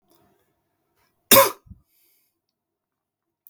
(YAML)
cough_length: 3.5 s
cough_amplitude: 32768
cough_signal_mean_std_ratio: 0.18
survey_phase: beta (2021-08-13 to 2022-03-07)
age: 18-44
gender: Male
wearing_mask: 'No'
symptom_none: true
symptom_onset: 7 days
smoker_status: Never smoked
respiratory_condition_asthma: false
respiratory_condition_other: false
recruitment_source: REACT
submission_delay: 3 days
covid_test_result: Positive
covid_test_method: RT-qPCR
covid_ct_value: 25.0
covid_ct_gene: N gene
influenza_a_test_result: Negative
influenza_b_test_result: Negative